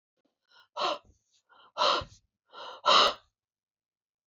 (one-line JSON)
{"exhalation_length": "4.3 s", "exhalation_amplitude": 12617, "exhalation_signal_mean_std_ratio": 0.32, "survey_phase": "beta (2021-08-13 to 2022-03-07)", "age": "45-64", "gender": "Female", "wearing_mask": "No", "symptom_none": true, "smoker_status": "Never smoked", "respiratory_condition_asthma": false, "respiratory_condition_other": false, "recruitment_source": "REACT", "submission_delay": "2 days", "covid_test_result": "Negative", "covid_test_method": "RT-qPCR", "influenza_a_test_result": "Negative", "influenza_b_test_result": "Negative"}